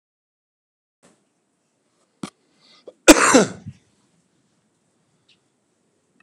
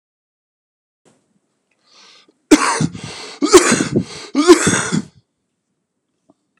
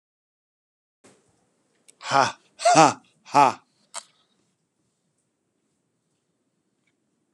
{"cough_length": "6.2 s", "cough_amplitude": 32768, "cough_signal_mean_std_ratio": 0.18, "three_cough_length": "6.6 s", "three_cough_amplitude": 32768, "three_cough_signal_mean_std_ratio": 0.35, "exhalation_length": "7.3 s", "exhalation_amplitude": 28791, "exhalation_signal_mean_std_ratio": 0.22, "survey_phase": "beta (2021-08-13 to 2022-03-07)", "age": "45-64", "gender": "Male", "wearing_mask": "No", "symptom_cough_any": true, "symptom_new_continuous_cough": true, "symptom_shortness_of_breath": true, "symptom_sore_throat": true, "symptom_fatigue": true, "symptom_fever_high_temperature": true, "symptom_headache": true, "symptom_change_to_sense_of_smell_or_taste": true, "symptom_loss_of_taste": true, "symptom_onset": "2 days", "smoker_status": "Never smoked", "respiratory_condition_asthma": false, "respiratory_condition_other": false, "recruitment_source": "Test and Trace", "submission_delay": "1 day", "covid_test_result": "Positive", "covid_test_method": "RT-qPCR"}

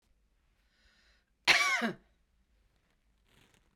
{"cough_length": "3.8 s", "cough_amplitude": 9313, "cough_signal_mean_std_ratio": 0.27, "survey_phase": "beta (2021-08-13 to 2022-03-07)", "age": "45-64", "gender": "Female", "wearing_mask": "No", "symptom_none": true, "smoker_status": "Never smoked", "respiratory_condition_asthma": false, "respiratory_condition_other": false, "recruitment_source": "REACT", "submission_delay": "1 day", "covid_test_result": "Negative", "covid_test_method": "RT-qPCR", "influenza_a_test_result": "Negative", "influenza_b_test_result": "Negative"}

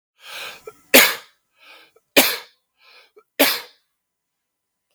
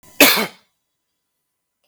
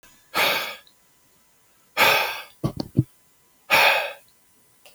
{"three_cough_length": "4.9 s", "three_cough_amplitude": 32768, "three_cough_signal_mean_std_ratio": 0.27, "cough_length": "1.9 s", "cough_amplitude": 32768, "cough_signal_mean_std_ratio": 0.28, "exhalation_length": "4.9 s", "exhalation_amplitude": 25508, "exhalation_signal_mean_std_ratio": 0.41, "survey_phase": "beta (2021-08-13 to 2022-03-07)", "age": "18-44", "gender": "Male", "wearing_mask": "No", "symptom_none": true, "smoker_status": "Never smoked", "respiratory_condition_asthma": false, "respiratory_condition_other": false, "recruitment_source": "REACT", "submission_delay": "1 day", "covid_test_result": "Negative", "covid_test_method": "RT-qPCR"}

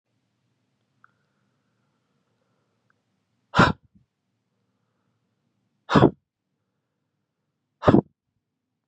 {"exhalation_length": "8.9 s", "exhalation_amplitude": 28486, "exhalation_signal_mean_std_ratio": 0.17, "survey_phase": "beta (2021-08-13 to 2022-03-07)", "age": "18-44", "gender": "Male", "wearing_mask": "No", "symptom_cough_any": true, "symptom_new_continuous_cough": true, "symptom_fatigue": true, "symptom_change_to_sense_of_smell_or_taste": true, "symptom_loss_of_taste": true, "symptom_onset": "6 days", "smoker_status": "Ex-smoker", "respiratory_condition_asthma": false, "respiratory_condition_other": false, "recruitment_source": "Test and Trace", "submission_delay": "1 day", "covid_test_result": "Positive", "covid_test_method": "RT-qPCR", "covid_ct_value": 17.2, "covid_ct_gene": "ORF1ab gene", "covid_ct_mean": 17.4, "covid_viral_load": "1900000 copies/ml", "covid_viral_load_category": "High viral load (>1M copies/ml)"}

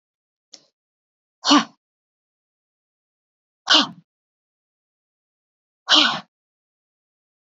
{"exhalation_length": "7.5 s", "exhalation_amplitude": 28803, "exhalation_signal_mean_std_ratio": 0.22, "survey_phase": "beta (2021-08-13 to 2022-03-07)", "age": "18-44", "gender": "Female", "wearing_mask": "No", "symptom_runny_or_blocked_nose": true, "symptom_fatigue": true, "symptom_headache": true, "symptom_other": true, "symptom_onset": "2 days", "smoker_status": "Never smoked", "respiratory_condition_asthma": false, "respiratory_condition_other": false, "recruitment_source": "Test and Trace", "submission_delay": "1 day", "covid_test_result": "Positive", "covid_test_method": "RT-qPCR", "covid_ct_value": 27.8, "covid_ct_gene": "ORF1ab gene", "covid_ct_mean": 28.2, "covid_viral_load": "570 copies/ml", "covid_viral_load_category": "Minimal viral load (< 10K copies/ml)"}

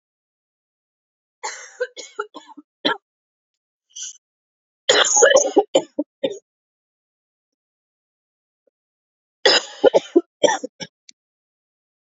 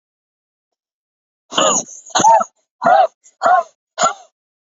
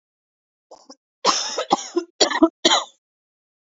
{"three_cough_length": "12.0 s", "three_cough_amplitude": 29540, "three_cough_signal_mean_std_ratio": 0.28, "exhalation_length": "4.8 s", "exhalation_amplitude": 28526, "exhalation_signal_mean_std_ratio": 0.41, "cough_length": "3.8 s", "cough_amplitude": 28722, "cough_signal_mean_std_ratio": 0.36, "survey_phase": "beta (2021-08-13 to 2022-03-07)", "age": "18-44", "gender": "Female", "wearing_mask": "No", "symptom_cough_any": true, "smoker_status": "Never smoked", "respiratory_condition_asthma": false, "respiratory_condition_other": false, "recruitment_source": "Test and Trace", "submission_delay": "1 day", "covid_test_result": "Negative", "covid_test_method": "RT-qPCR"}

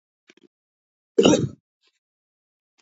{"cough_length": "2.8 s", "cough_amplitude": 27400, "cough_signal_mean_std_ratio": 0.24, "survey_phase": "beta (2021-08-13 to 2022-03-07)", "age": "45-64", "gender": "Male", "wearing_mask": "No", "symptom_cough_any": true, "symptom_new_continuous_cough": true, "symptom_sore_throat": true, "symptom_headache": true, "smoker_status": "Ex-smoker", "respiratory_condition_asthma": false, "respiratory_condition_other": false, "recruitment_source": "Test and Trace", "submission_delay": "2 days", "covid_test_result": "Positive", "covid_test_method": "RT-qPCR", "covid_ct_value": 20.3, "covid_ct_gene": "ORF1ab gene", "covid_ct_mean": 20.5, "covid_viral_load": "190000 copies/ml", "covid_viral_load_category": "Low viral load (10K-1M copies/ml)"}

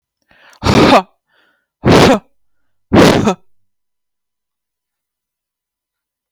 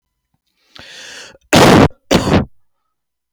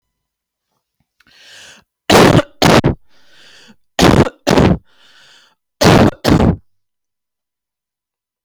{"exhalation_length": "6.3 s", "exhalation_amplitude": 32768, "exhalation_signal_mean_std_ratio": 0.36, "cough_length": "3.3 s", "cough_amplitude": 32768, "cough_signal_mean_std_ratio": 0.39, "three_cough_length": "8.4 s", "three_cough_amplitude": 32768, "three_cough_signal_mean_std_ratio": 0.38, "survey_phase": "beta (2021-08-13 to 2022-03-07)", "age": "18-44", "gender": "Female", "wearing_mask": "No", "symptom_none": true, "smoker_status": "Never smoked", "recruitment_source": "REACT", "submission_delay": "1 day", "covid_test_result": "Negative", "covid_test_method": "RT-qPCR", "influenza_a_test_result": "Negative", "influenza_b_test_result": "Negative"}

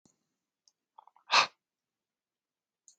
{"exhalation_length": "3.0 s", "exhalation_amplitude": 9638, "exhalation_signal_mean_std_ratio": 0.17, "survey_phase": "alpha (2021-03-01 to 2021-08-12)", "age": "45-64", "gender": "Male", "wearing_mask": "No", "symptom_none": true, "smoker_status": "Never smoked", "respiratory_condition_asthma": false, "respiratory_condition_other": false, "recruitment_source": "Test and Trace", "submission_delay": "1 day", "covid_test_result": "Positive", "covid_test_method": "RT-qPCR"}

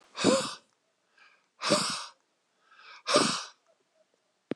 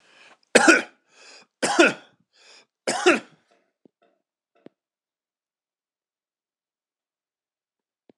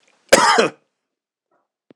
{"exhalation_length": "4.6 s", "exhalation_amplitude": 12034, "exhalation_signal_mean_std_ratio": 0.38, "three_cough_length": "8.2 s", "three_cough_amplitude": 26028, "three_cough_signal_mean_std_ratio": 0.23, "cough_length": "2.0 s", "cough_amplitude": 26028, "cough_signal_mean_std_ratio": 0.34, "survey_phase": "alpha (2021-03-01 to 2021-08-12)", "age": "45-64", "gender": "Male", "wearing_mask": "No", "symptom_none": true, "smoker_status": "Never smoked", "respiratory_condition_asthma": false, "respiratory_condition_other": false, "recruitment_source": "REACT", "submission_delay": "5 days", "covid_test_result": "Negative", "covid_test_method": "RT-qPCR"}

